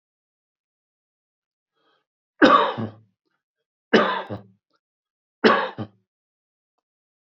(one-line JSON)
{"three_cough_length": "7.3 s", "three_cough_amplitude": 29070, "three_cough_signal_mean_std_ratio": 0.26, "survey_phase": "beta (2021-08-13 to 2022-03-07)", "age": "45-64", "gender": "Male", "wearing_mask": "No", "symptom_cough_any": true, "symptom_runny_or_blocked_nose": true, "symptom_sore_throat": true, "symptom_fatigue": true, "symptom_headache": true, "symptom_other": true, "smoker_status": "Never smoked", "respiratory_condition_asthma": false, "respiratory_condition_other": false, "recruitment_source": "Test and Trace", "submission_delay": "1 day", "covid_test_result": "Positive", "covid_test_method": "RT-qPCR", "covid_ct_value": 21.1, "covid_ct_gene": "ORF1ab gene", "covid_ct_mean": 21.4, "covid_viral_load": "96000 copies/ml", "covid_viral_load_category": "Low viral load (10K-1M copies/ml)"}